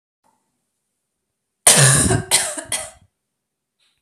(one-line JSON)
{"cough_length": "4.0 s", "cough_amplitude": 32768, "cough_signal_mean_std_ratio": 0.36, "survey_phase": "alpha (2021-03-01 to 2021-08-12)", "age": "18-44", "gender": "Female", "wearing_mask": "No", "symptom_none": true, "symptom_onset": "12 days", "smoker_status": "Never smoked", "respiratory_condition_asthma": false, "respiratory_condition_other": false, "recruitment_source": "REACT", "submission_delay": "1 day", "covid_test_result": "Negative", "covid_test_method": "RT-qPCR"}